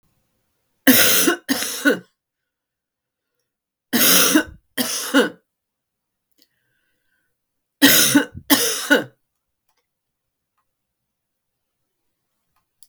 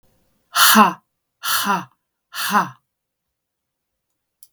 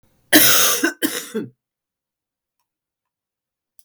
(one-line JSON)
{"three_cough_length": "12.9 s", "three_cough_amplitude": 32768, "three_cough_signal_mean_std_ratio": 0.35, "exhalation_length": "4.5 s", "exhalation_amplitude": 32766, "exhalation_signal_mean_std_ratio": 0.35, "cough_length": "3.8 s", "cough_amplitude": 32768, "cough_signal_mean_std_ratio": 0.35, "survey_phase": "beta (2021-08-13 to 2022-03-07)", "age": "65+", "gender": "Female", "wearing_mask": "No", "symptom_cough_any": true, "symptom_runny_or_blocked_nose": true, "symptom_fever_high_temperature": true, "symptom_loss_of_taste": true, "symptom_other": true, "smoker_status": "Ex-smoker", "respiratory_condition_asthma": false, "respiratory_condition_other": false, "recruitment_source": "Test and Trace", "submission_delay": "2 days", "covid_test_result": "Positive", "covid_test_method": "RT-qPCR", "covid_ct_value": 13.6, "covid_ct_gene": "ORF1ab gene", "covid_ct_mean": 13.8, "covid_viral_load": "30000000 copies/ml", "covid_viral_load_category": "High viral load (>1M copies/ml)"}